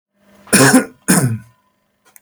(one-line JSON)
{"cough_length": "2.2 s", "cough_amplitude": 32768, "cough_signal_mean_std_ratio": 0.44, "survey_phase": "beta (2021-08-13 to 2022-03-07)", "age": "65+", "gender": "Male", "wearing_mask": "No", "symptom_none": true, "symptom_onset": "4 days", "smoker_status": "Never smoked", "respiratory_condition_asthma": false, "respiratory_condition_other": false, "recruitment_source": "REACT", "submission_delay": "1 day", "covid_test_result": "Negative", "covid_test_method": "RT-qPCR", "influenza_a_test_result": "Negative", "influenza_b_test_result": "Negative"}